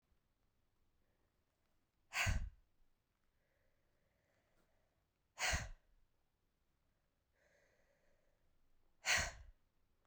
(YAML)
exhalation_length: 10.1 s
exhalation_amplitude: 2251
exhalation_signal_mean_std_ratio: 0.26
survey_phase: beta (2021-08-13 to 2022-03-07)
age: 18-44
gender: Male
wearing_mask: 'No'
symptom_new_continuous_cough: true
symptom_runny_or_blocked_nose: true
symptom_change_to_sense_of_smell_or_taste: true
symptom_loss_of_taste: true
symptom_other: true
smoker_status: Never smoked
respiratory_condition_asthma: false
respiratory_condition_other: false
recruitment_source: Test and Trace
submission_delay: 2 days
covid_test_result: Negative
covid_test_method: RT-qPCR